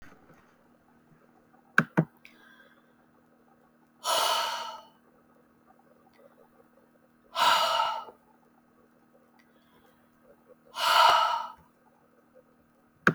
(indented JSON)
{
  "exhalation_length": "13.1 s",
  "exhalation_amplitude": 20917,
  "exhalation_signal_mean_std_ratio": 0.32,
  "survey_phase": "beta (2021-08-13 to 2022-03-07)",
  "age": "45-64",
  "gender": "Female",
  "wearing_mask": "No",
  "symptom_none": true,
  "smoker_status": "Ex-smoker",
  "respiratory_condition_asthma": false,
  "respiratory_condition_other": false,
  "recruitment_source": "REACT",
  "submission_delay": "1 day",
  "covid_test_result": "Negative",
  "covid_test_method": "RT-qPCR",
  "influenza_a_test_result": "Unknown/Void",
  "influenza_b_test_result": "Unknown/Void"
}